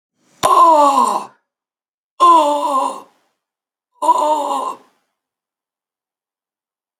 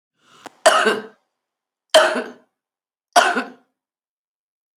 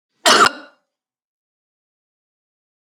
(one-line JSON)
{"exhalation_length": "7.0 s", "exhalation_amplitude": 32767, "exhalation_signal_mean_std_ratio": 0.46, "three_cough_length": "4.8 s", "three_cough_amplitude": 32768, "three_cough_signal_mean_std_ratio": 0.32, "cough_length": "2.8 s", "cough_amplitude": 31224, "cough_signal_mean_std_ratio": 0.24, "survey_phase": "beta (2021-08-13 to 2022-03-07)", "age": "45-64", "gender": "Female", "wearing_mask": "No", "symptom_runny_or_blocked_nose": true, "symptom_fatigue": true, "smoker_status": "Current smoker (11 or more cigarettes per day)", "respiratory_condition_asthma": false, "respiratory_condition_other": false, "recruitment_source": "REACT", "submission_delay": "2 days", "covid_test_result": "Negative", "covid_test_method": "RT-qPCR", "influenza_a_test_result": "Unknown/Void", "influenza_b_test_result": "Unknown/Void"}